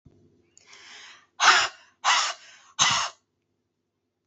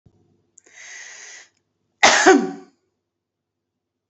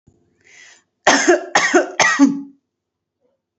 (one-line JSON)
{"exhalation_length": "4.3 s", "exhalation_amplitude": 19619, "exhalation_signal_mean_std_ratio": 0.36, "cough_length": "4.1 s", "cough_amplitude": 29743, "cough_signal_mean_std_ratio": 0.28, "three_cough_length": "3.6 s", "three_cough_amplitude": 28577, "three_cough_signal_mean_std_ratio": 0.44, "survey_phase": "alpha (2021-03-01 to 2021-08-12)", "age": "18-44", "gender": "Female", "wearing_mask": "No", "symptom_none": true, "smoker_status": "Never smoked", "respiratory_condition_asthma": false, "respiratory_condition_other": false, "recruitment_source": "REACT", "submission_delay": "1 day", "covid_test_result": "Negative", "covid_test_method": "RT-qPCR"}